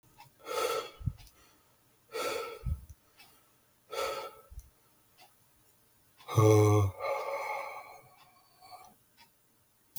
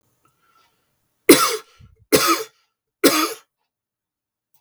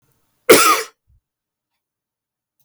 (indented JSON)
{
  "exhalation_length": "10.0 s",
  "exhalation_amplitude": 9103,
  "exhalation_signal_mean_std_ratio": 0.38,
  "three_cough_length": "4.6 s",
  "three_cough_amplitude": 32768,
  "three_cough_signal_mean_std_ratio": 0.3,
  "cough_length": "2.6 s",
  "cough_amplitude": 32768,
  "cough_signal_mean_std_ratio": 0.27,
  "survey_phase": "beta (2021-08-13 to 2022-03-07)",
  "age": "45-64",
  "gender": "Male",
  "wearing_mask": "No",
  "symptom_none": true,
  "smoker_status": "Never smoked",
  "respiratory_condition_asthma": false,
  "respiratory_condition_other": false,
  "recruitment_source": "REACT",
  "submission_delay": "2 days",
  "covid_test_result": "Negative",
  "covid_test_method": "RT-qPCR",
  "influenza_a_test_result": "Unknown/Void",
  "influenza_b_test_result": "Unknown/Void"
}